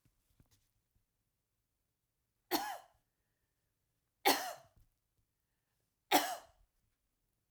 three_cough_length: 7.5 s
three_cough_amplitude: 6420
three_cough_signal_mean_std_ratio: 0.22
survey_phase: alpha (2021-03-01 to 2021-08-12)
age: 45-64
gender: Female
wearing_mask: 'Yes'
symptom_none: true
smoker_status: Never smoked
respiratory_condition_asthma: false
respiratory_condition_other: false
recruitment_source: REACT
submission_delay: 4 days
covid_test_result: Negative
covid_test_method: RT-qPCR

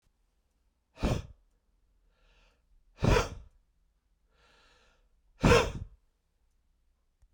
exhalation_length: 7.3 s
exhalation_amplitude: 11487
exhalation_signal_mean_std_ratio: 0.25
survey_phase: beta (2021-08-13 to 2022-03-07)
age: 45-64
gender: Male
wearing_mask: 'No'
symptom_cough_any: true
symptom_shortness_of_breath: true
symptom_diarrhoea: true
symptom_fatigue: true
symptom_change_to_sense_of_smell_or_taste: true
symptom_onset: 6 days
smoker_status: Ex-smoker
respiratory_condition_asthma: false
respiratory_condition_other: false
recruitment_source: Test and Trace
submission_delay: 1 day
covid_test_result: Positive
covid_test_method: RT-qPCR
covid_ct_value: 14.8
covid_ct_gene: ORF1ab gene
covid_ct_mean: 15.2
covid_viral_load: 10000000 copies/ml
covid_viral_load_category: High viral load (>1M copies/ml)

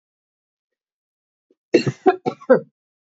cough_length: 3.1 s
cough_amplitude: 28636
cough_signal_mean_std_ratio: 0.25
survey_phase: beta (2021-08-13 to 2022-03-07)
age: 45-64
gender: Female
wearing_mask: 'No'
symptom_cough_any: true
symptom_runny_or_blocked_nose: true
symptom_sore_throat: true
symptom_fatigue: true
symptom_headache: true
symptom_change_to_sense_of_smell_or_taste: true
symptom_onset: 3 days
smoker_status: Never smoked
respiratory_condition_asthma: false
respiratory_condition_other: false
recruitment_source: Test and Trace
submission_delay: 1 day
covid_test_result: Positive
covid_test_method: ePCR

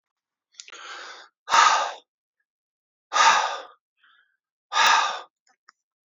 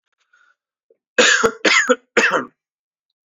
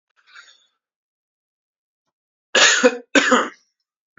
exhalation_length: 6.1 s
exhalation_amplitude: 23088
exhalation_signal_mean_std_ratio: 0.37
three_cough_length: 3.2 s
three_cough_amplitude: 28769
three_cough_signal_mean_std_ratio: 0.42
cough_length: 4.2 s
cough_amplitude: 29459
cough_signal_mean_std_ratio: 0.31
survey_phase: beta (2021-08-13 to 2022-03-07)
age: 18-44
gender: Male
wearing_mask: 'No'
symptom_cough_any: true
symptom_sore_throat: true
symptom_headache: true
symptom_loss_of_taste: true
smoker_status: Ex-smoker
respiratory_condition_asthma: false
respiratory_condition_other: false
recruitment_source: Test and Trace
submission_delay: 2 days
covid_test_result: Positive
covid_test_method: RT-qPCR
covid_ct_value: 26.0
covid_ct_gene: ORF1ab gene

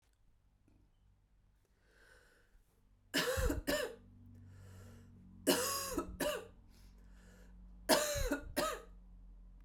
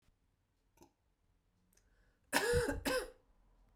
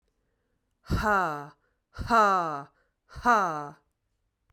three_cough_length: 9.6 s
three_cough_amplitude: 6030
three_cough_signal_mean_std_ratio: 0.46
cough_length: 3.8 s
cough_amplitude: 6787
cough_signal_mean_std_ratio: 0.36
exhalation_length: 4.5 s
exhalation_amplitude: 12116
exhalation_signal_mean_std_ratio: 0.44
survey_phase: beta (2021-08-13 to 2022-03-07)
age: 18-44
gender: Female
wearing_mask: 'No'
symptom_none: true
smoker_status: Never smoked
respiratory_condition_asthma: false
respiratory_condition_other: false
recruitment_source: REACT
submission_delay: 1 day
covid_test_result: Negative
covid_test_method: RT-qPCR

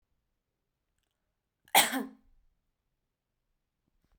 cough_length: 4.2 s
cough_amplitude: 13224
cough_signal_mean_std_ratio: 0.18
survey_phase: beta (2021-08-13 to 2022-03-07)
age: 18-44
gender: Female
wearing_mask: 'No'
symptom_none: true
smoker_status: Current smoker (1 to 10 cigarettes per day)
respiratory_condition_asthma: false
respiratory_condition_other: false
recruitment_source: REACT
submission_delay: 2 days
covid_test_result: Negative
covid_test_method: RT-qPCR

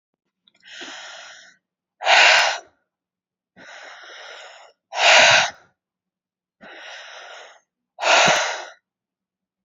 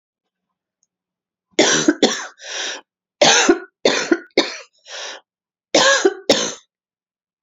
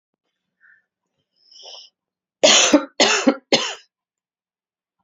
exhalation_length: 9.6 s
exhalation_amplitude: 30105
exhalation_signal_mean_std_ratio: 0.35
three_cough_length: 7.4 s
three_cough_amplitude: 32703
three_cough_signal_mean_std_ratio: 0.42
cough_length: 5.0 s
cough_amplitude: 32767
cough_signal_mean_std_ratio: 0.32
survey_phase: beta (2021-08-13 to 2022-03-07)
age: 18-44
gender: Female
wearing_mask: 'No'
symptom_cough_any: true
symptom_runny_or_blocked_nose: true
symptom_shortness_of_breath: true
symptom_headache: true
smoker_status: Ex-smoker
respiratory_condition_asthma: false
respiratory_condition_other: false
recruitment_source: Test and Trace
submission_delay: 2 days
covid_test_result: Positive
covid_test_method: RT-qPCR
covid_ct_value: 25.3
covid_ct_gene: N gene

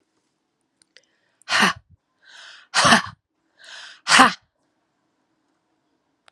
exhalation_length: 6.3 s
exhalation_amplitude: 32767
exhalation_signal_mean_std_ratio: 0.27
survey_phase: alpha (2021-03-01 to 2021-08-12)
age: 45-64
gender: Female
wearing_mask: 'No'
symptom_fatigue: true
symptom_headache: true
symptom_onset: 3 days
smoker_status: Ex-smoker
respiratory_condition_asthma: false
respiratory_condition_other: false
recruitment_source: Test and Trace
submission_delay: 2 days
covid_test_result: Positive
covid_test_method: RT-qPCR
covid_ct_value: 28.6
covid_ct_gene: ORF1ab gene
covid_ct_mean: 28.7
covid_viral_load: 380 copies/ml
covid_viral_load_category: Minimal viral load (< 10K copies/ml)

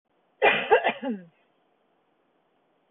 three_cough_length: 2.9 s
three_cough_amplitude: 18967
three_cough_signal_mean_std_ratio: 0.33
survey_phase: beta (2021-08-13 to 2022-03-07)
age: 45-64
gender: Female
wearing_mask: 'No'
symptom_none: true
smoker_status: Never smoked
respiratory_condition_asthma: false
respiratory_condition_other: false
recruitment_source: REACT
submission_delay: 4 days
covid_test_result: Negative
covid_test_method: RT-qPCR
influenza_a_test_result: Negative
influenza_b_test_result: Negative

